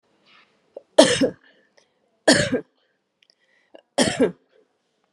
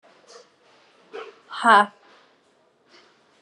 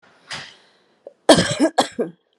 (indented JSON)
{
  "three_cough_length": "5.1 s",
  "three_cough_amplitude": 32768,
  "three_cough_signal_mean_std_ratio": 0.3,
  "exhalation_length": "3.4 s",
  "exhalation_amplitude": 28188,
  "exhalation_signal_mean_std_ratio": 0.23,
  "cough_length": "2.4 s",
  "cough_amplitude": 32768,
  "cough_signal_mean_std_ratio": 0.35,
  "survey_phase": "beta (2021-08-13 to 2022-03-07)",
  "age": "45-64",
  "gender": "Female",
  "wearing_mask": "Yes",
  "symptom_runny_or_blocked_nose": true,
  "symptom_sore_throat": true,
  "symptom_fatigue": true,
  "smoker_status": "Ex-smoker",
  "respiratory_condition_asthma": false,
  "respiratory_condition_other": false,
  "recruitment_source": "REACT",
  "submission_delay": "0 days",
  "covid_test_result": "Negative",
  "covid_test_method": "RT-qPCR",
  "influenza_a_test_result": "Unknown/Void",
  "influenza_b_test_result": "Unknown/Void"
}